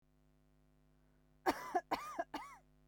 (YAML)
three_cough_length: 2.9 s
three_cough_amplitude: 3993
three_cough_signal_mean_std_ratio: 0.35
survey_phase: beta (2021-08-13 to 2022-03-07)
age: 18-44
gender: Female
wearing_mask: 'No'
symptom_none: true
symptom_onset: 4 days
smoker_status: Never smoked
respiratory_condition_asthma: true
respiratory_condition_other: false
recruitment_source: REACT
submission_delay: 2 days
covid_test_result: Negative
covid_test_method: RT-qPCR
influenza_a_test_result: Negative
influenza_b_test_result: Negative